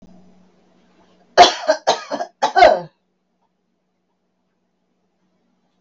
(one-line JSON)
{"cough_length": "5.8 s", "cough_amplitude": 32768, "cough_signal_mean_std_ratio": 0.27, "survey_phase": "beta (2021-08-13 to 2022-03-07)", "age": "65+", "gender": "Female", "wearing_mask": "No", "symptom_none": true, "smoker_status": "Never smoked", "respiratory_condition_asthma": false, "respiratory_condition_other": false, "recruitment_source": "REACT", "submission_delay": "2 days", "covid_test_result": "Negative", "covid_test_method": "RT-qPCR", "influenza_a_test_result": "Negative", "influenza_b_test_result": "Negative"}